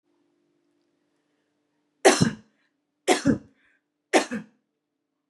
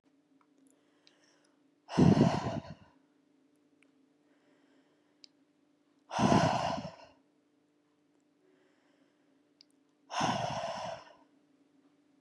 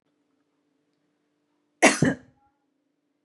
{"three_cough_length": "5.3 s", "three_cough_amplitude": 24029, "three_cough_signal_mean_std_ratio": 0.26, "exhalation_length": "12.2 s", "exhalation_amplitude": 9003, "exhalation_signal_mean_std_ratio": 0.31, "cough_length": "3.2 s", "cough_amplitude": 25464, "cough_signal_mean_std_ratio": 0.21, "survey_phase": "beta (2021-08-13 to 2022-03-07)", "age": "18-44", "gender": "Female", "wearing_mask": "No", "symptom_none": true, "symptom_onset": "10 days", "smoker_status": "Never smoked", "respiratory_condition_asthma": false, "respiratory_condition_other": false, "recruitment_source": "REACT", "submission_delay": "2 days", "covid_test_result": "Negative", "covid_test_method": "RT-qPCR", "influenza_a_test_result": "Unknown/Void", "influenza_b_test_result": "Unknown/Void"}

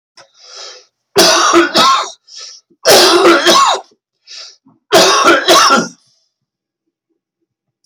{"three_cough_length": "7.9 s", "three_cough_amplitude": 32768, "three_cough_signal_mean_std_ratio": 0.55, "survey_phase": "alpha (2021-03-01 to 2021-08-12)", "age": "65+", "gender": "Male", "wearing_mask": "No", "symptom_cough_any": true, "symptom_onset": "12 days", "smoker_status": "Never smoked", "respiratory_condition_asthma": false, "respiratory_condition_other": false, "recruitment_source": "REACT", "submission_delay": "1 day", "covid_test_result": "Negative", "covid_test_method": "RT-qPCR"}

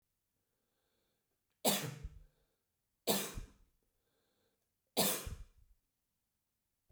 {"three_cough_length": "6.9 s", "three_cough_amplitude": 5957, "three_cough_signal_mean_std_ratio": 0.29, "survey_phase": "beta (2021-08-13 to 2022-03-07)", "age": "45-64", "gender": "Male", "wearing_mask": "No", "symptom_none": true, "smoker_status": "Never smoked", "respiratory_condition_asthma": false, "respiratory_condition_other": false, "recruitment_source": "REACT", "submission_delay": "1 day", "covid_test_result": "Negative", "covid_test_method": "RT-qPCR"}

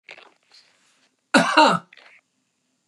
{"cough_length": "2.9 s", "cough_amplitude": 30958, "cough_signal_mean_std_ratio": 0.3, "survey_phase": "beta (2021-08-13 to 2022-03-07)", "age": "65+", "gender": "Female", "wearing_mask": "No", "symptom_change_to_sense_of_smell_or_taste": true, "smoker_status": "Never smoked", "respiratory_condition_asthma": true, "respiratory_condition_other": false, "recruitment_source": "REACT", "submission_delay": "1 day", "covid_test_result": "Negative", "covid_test_method": "RT-qPCR", "influenza_a_test_result": "Negative", "influenza_b_test_result": "Negative"}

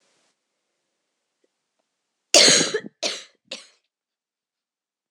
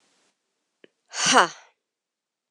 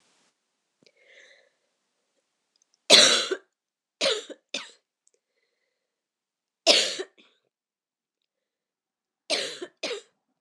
{"cough_length": "5.1 s", "cough_amplitude": 26028, "cough_signal_mean_std_ratio": 0.24, "exhalation_length": "2.5 s", "exhalation_amplitude": 25694, "exhalation_signal_mean_std_ratio": 0.24, "three_cough_length": "10.4 s", "three_cough_amplitude": 26028, "three_cough_signal_mean_std_ratio": 0.24, "survey_phase": "beta (2021-08-13 to 2022-03-07)", "age": "18-44", "gender": "Female", "wearing_mask": "No", "symptom_cough_any": true, "symptom_new_continuous_cough": true, "symptom_runny_or_blocked_nose": true, "symptom_sore_throat": true, "symptom_fatigue": true, "symptom_headache": true, "symptom_change_to_sense_of_smell_or_taste": true, "symptom_onset": "8 days", "smoker_status": "Never smoked", "respiratory_condition_asthma": false, "respiratory_condition_other": false, "recruitment_source": "Test and Trace", "submission_delay": "2 days", "covid_test_result": "Positive", "covid_test_method": "RT-qPCR"}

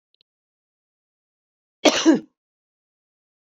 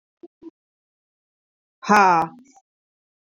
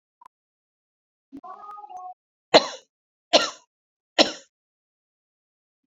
{"cough_length": "3.4 s", "cough_amplitude": 27413, "cough_signal_mean_std_ratio": 0.22, "exhalation_length": "3.3 s", "exhalation_amplitude": 27680, "exhalation_signal_mean_std_ratio": 0.27, "three_cough_length": "5.9 s", "three_cough_amplitude": 32397, "three_cough_signal_mean_std_ratio": 0.19, "survey_phase": "beta (2021-08-13 to 2022-03-07)", "age": "45-64", "gender": "Female", "wearing_mask": "No", "symptom_cough_any": true, "symptom_runny_or_blocked_nose": true, "symptom_fatigue": true, "symptom_headache": true, "symptom_onset": "3 days", "smoker_status": "Never smoked", "respiratory_condition_asthma": false, "respiratory_condition_other": false, "recruitment_source": "Test and Trace", "submission_delay": "2 days", "covid_test_result": "Positive", "covid_test_method": "RT-qPCR", "covid_ct_value": 19.7, "covid_ct_gene": "ORF1ab gene", "covid_ct_mean": 20.1, "covid_viral_load": "250000 copies/ml", "covid_viral_load_category": "Low viral load (10K-1M copies/ml)"}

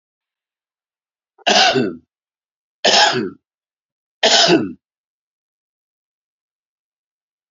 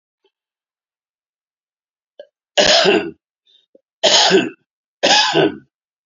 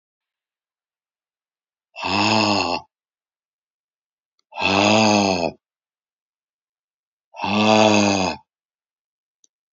{"three_cough_length": "7.5 s", "three_cough_amplitude": 32767, "three_cough_signal_mean_std_ratio": 0.33, "cough_length": "6.1 s", "cough_amplitude": 32288, "cough_signal_mean_std_ratio": 0.4, "exhalation_length": "9.7 s", "exhalation_amplitude": 28152, "exhalation_signal_mean_std_ratio": 0.42, "survey_phase": "beta (2021-08-13 to 2022-03-07)", "age": "65+", "gender": "Male", "wearing_mask": "No", "symptom_none": true, "smoker_status": "Ex-smoker", "respiratory_condition_asthma": false, "respiratory_condition_other": false, "recruitment_source": "REACT", "submission_delay": "1 day", "covid_test_result": "Negative", "covid_test_method": "RT-qPCR"}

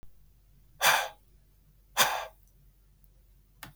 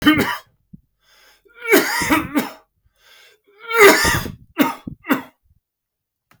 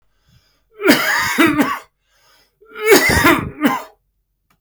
{"exhalation_length": "3.8 s", "exhalation_amplitude": 15008, "exhalation_signal_mean_std_ratio": 0.31, "three_cough_length": "6.4 s", "three_cough_amplitude": 32766, "three_cough_signal_mean_std_ratio": 0.41, "cough_length": "4.6 s", "cough_amplitude": 32768, "cough_signal_mean_std_ratio": 0.51, "survey_phase": "beta (2021-08-13 to 2022-03-07)", "age": "45-64", "gender": "Male", "wearing_mask": "No", "symptom_sore_throat": true, "smoker_status": "Never smoked", "respiratory_condition_asthma": false, "respiratory_condition_other": false, "recruitment_source": "Test and Trace", "submission_delay": "4 days", "covid_test_result": "Negative", "covid_test_method": "ePCR"}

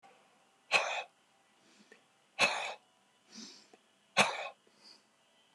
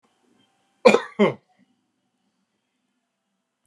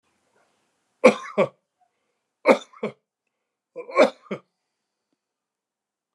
{"exhalation_length": "5.5 s", "exhalation_amplitude": 7817, "exhalation_signal_mean_std_ratio": 0.31, "cough_length": "3.7 s", "cough_amplitude": 28941, "cough_signal_mean_std_ratio": 0.2, "three_cough_length": "6.1 s", "three_cough_amplitude": 29204, "three_cough_signal_mean_std_ratio": 0.22, "survey_phase": "beta (2021-08-13 to 2022-03-07)", "age": "65+", "gender": "Male", "wearing_mask": "No", "symptom_none": true, "smoker_status": "Ex-smoker", "respiratory_condition_asthma": false, "respiratory_condition_other": true, "recruitment_source": "REACT", "submission_delay": "1 day", "covid_test_result": "Negative", "covid_test_method": "RT-qPCR"}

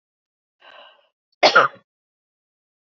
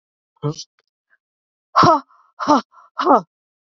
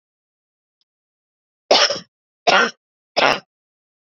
{"cough_length": "3.0 s", "cough_amplitude": 27640, "cough_signal_mean_std_ratio": 0.22, "exhalation_length": "3.8 s", "exhalation_amplitude": 27839, "exhalation_signal_mean_std_ratio": 0.33, "three_cough_length": "4.0 s", "three_cough_amplitude": 30569, "three_cough_signal_mean_std_ratio": 0.31, "survey_phase": "beta (2021-08-13 to 2022-03-07)", "age": "45-64", "gender": "Female", "wearing_mask": "No", "symptom_shortness_of_breath": true, "symptom_fatigue": true, "smoker_status": "Never smoked", "respiratory_condition_asthma": false, "respiratory_condition_other": false, "recruitment_source": "REACT", "submission_delay": "2 days", "covid_test_result": "Negative", "covid_test_method": "RT-qPCR", "influenza_a_test_result": "Negative", "influenza_b_test_result": "Negative"}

